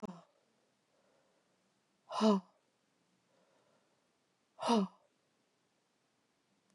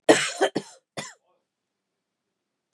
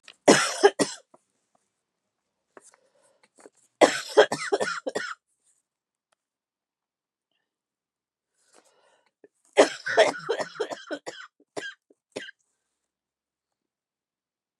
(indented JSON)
{
  "exhalation_length": "6.7 s",
  "exhalation_amplitude": 4703,
  "exhalation_signal_mean_std_ratio": 0.23,
  "cough_length": "2.7 s",
  "cough_amplitude": 28292,
  "cough_signal_mean_std_ratio": 0.26,
  "three_cough_length": "14.6 s",
  "three_cough_amplitude": 28847,
  "three_cough_signal_mean_std_ratio": 0.25,
  "survey_phase": "beta (2021-08-13 to 2022-03-07)",
  "age": "45-64",
  "gender": "Female",
  "wearing_mask": "No",
  "symptom_cough_any": true,
  "symptom_runny_or_blocked_nose": true,
  "symptom_shortness_of_breath": true,
  "symptom_fatigue": true,
  "smoker_status": "Never smoked",
  "respiratory_condition_asthma": true,
  "respiratory_condition_other": false,
  "recruitment_source": "Test and Trace",
  "submission_delay": "3 days",
  "covid_test_result": "Positive",
  "covid_test_method": "RT-qPCR",
  "covid_ct_value": 31.2,
  "covid_ct_gene": "N gene"
}